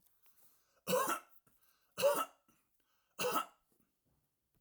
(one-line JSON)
{"three_cough_length": "4.6 s", "three_cough_amplitude": 3092, "three_cough_signal_mean_std_ratio": 0.35, "survey_phase": "alpha (2021-03-01 to 2021-08-12)", "age": "65+", "gender": "Male", "wearing_mask": "No", "symptom_none": true, "smoker_status": "Ex-smoker", "respiratory_condition_asthma": false, "respiratory_condition_other": false, "recruitment_source": "REACT", "submission_delay": "2 days", "covid_test_result": "Negative", "covid_test_method": "RT-qPCR"}